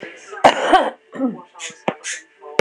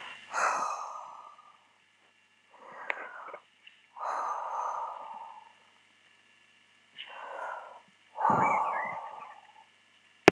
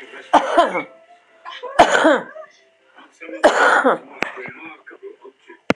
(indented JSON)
{
  "cough_length": "2.6 s",
  "cough_amplitude": 26028,
  "cough_signal_mean_std_ratio": 0.43,
  "exhalation_length": "10.3 s",
  "exhalation_amplitude": 26028,
  "exhalation_signal_mean_std_ratio": 0.4,
  "three_cough_length": "5.8 s",
  "three_cough_amplitude": 26028,
  "three_cough_signal_mean_std_ratio": 0.44,
  "survey_phase": "alpha (2021-03-01 to 2021-08-12)",
  "age": "65+",
  "gender": "Female",
  "wearing_mask": "No",
  "symptom_none": true,
  "smoker_status": "Ex-smoker",
  "respiratory_condition_asthma": true,
  "respiratory_condition_other": true,
  "recruitment_source": "REACT",
  "submission_delay": "1 day",
  "covid_test_result": "Negative",
  "covid_test_method": "RT-qPCR"
}